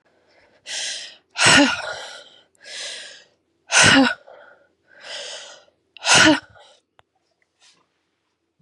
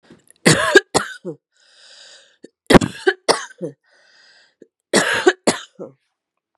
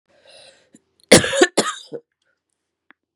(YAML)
exhalation_length: 8.6 s
exhalation_amplitude: 30329
exhalation_signal_mean_std_ratio: 0.35
three_cough_length: 6.6 s
three_cough_amplitude: 32768
three_cough_signal_mean_std_ratio: 0.32
cough_length: 3.2 s
cough_amplitude: 32768
cough_signal_mean_std_ratio: 0.27
survey_phase: beta (2021-08-13 to 2022-03-07)
age: 45-64
gender: Female
wearing_mask: 'No'
symptom_runny_or_blocked_nose: true
symptom_onset: 3 days
smoker_status: Never smoked
respiratory_condition_asthma: true
respiratory_condition_other: false
recruitment_source: Test and Trace
submission_delay: 1 day
covid_test_result: Positive
covid_test_method: RT-qPCR
covid_ct_value: 22.8
covid_ct_gene: N gene